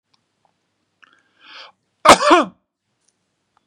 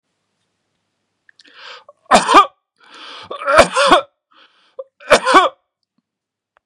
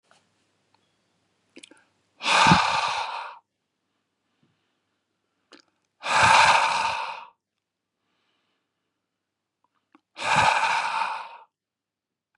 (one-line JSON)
{"cough_length": "3.7 s", "cough_amplitude": 32768, "cough_signal_mean_std_ratio": 0.24, "three_cough_length": "6.7 s", "three_cough_amplitude": 32768, "three_cough_signal_mean_std_ratio": 0.34, "exhalation_length": "12.4 s", "exhalation_amplitude": 23234, "exhalation_signal_mean_std_ratio": 0.37, "survey_phase": "beta (2021-08-13 to 2022-03-07)", "age": "45-64", "gender": "Male", "wearing_mask": "No", "symptom_none": true, "smoker_status": "Never smoked", "respiratory_condition_asthma": false, "respiratory_condition_other": false, "recruitment_source": "REACT", "submission_delay": "2 days", "covid_test_result": "Negative", "covid_test_method": "RT-qPCR", "covid_ct_value": 39.0, "covid_ct_gene": "N gene", "influenza_a_test_result": "Negative", "influenza_b_test_result": "Negative"}